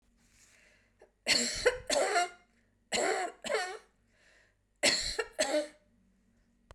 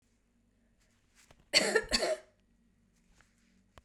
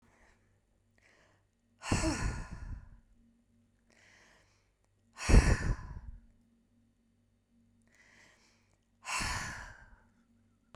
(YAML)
three_cough_length: 6.7 s
three_cough_amplitude: 8480
three_cough_signal_mean_std_ratio: 0.47
cough_length: 3.8 s
cough_amplitude: 10909
cough_signal_mean_std_ratio: 0.29
exhalation_length: 10.8 s
exhalation_amplitude: 10560
exhalation_signal_mean_std_ratio: 0.27
survey_phase: beta (2021-08-13 to 2022-03-07)
age: 65+
gender: Female
wearing_mask: 'No'
symptom_none: true
smoker_status: Ex-smoker
respiratory_condition_asthma: false
respiratory_condition_other: false
recruitment_source: REACT
submission_delay: 1 day
covid_test_result: Negative
covid_test_method: RT-qPCR
influenza_a_test_result: Negative
influenza_b_test_result: Negative